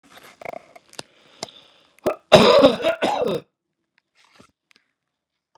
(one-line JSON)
{"cough_length": "5.6 s", "cough_amplitude": 32768, "cough_signal_mean_std_ratio": 0.31, "survey_phase": "beta (2021-08-13 to 2022-03-07)", "age": "65+", "gender": "Male", "wearing_mask": "No", "symptom_none": true, "smoker_status": "Never smoked", "respiratory_condition_asthma": false, "respiratory_condition_other": false, "recruitment_source": "REACT", "submission_delay": "2 days", "covid_test_result": "Negative", "covid_test_method": "RT-qPCR", "influenza_a_test_result": "Unknown/Void", "influenza_b_test_result": "Unknown/Void"}